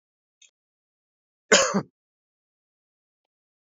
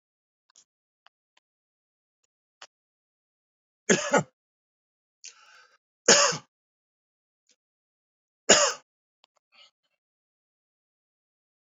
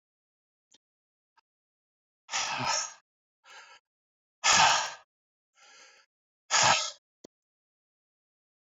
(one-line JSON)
{"cough_length": "3.8 s", "cough_amplitude": 23873, "cough_signal_mean_std_ratio": 0.2, "three_cough_length": "11.6 s", "three_cough_amplitude": 31521, "three_cough_signal_mean_std_ratio": 0.19, "exhalation_length": "8.7 s", "exhalation_amplitude": 11863, "exhalation_signal_mean_std_ratio": 0.3, "survey_phase": "beta (2021-08-13 to 2022-03-07)", "age": "45-64", "gender": "Male", "wearing_mask": "No", "symptom_none": true, "smoker_status": "Never smoked", "respiratory_condition_asthma": false, "respiratory_condition_other": false, "recruitment_source": "Test and Trace", "submission_delay": "1 day", "covid_test_result": "Positive", "covid_test_method": "RT-qPCR", "covid_ct_value": 33.3, "covid_ct_gene": "N gene", "covid_ct_mean": 34.1, "covid_viral_load": "6.7 copies/ml", "covid_viral_load_category": "Minimal viral load (< 10K copies/ml)"}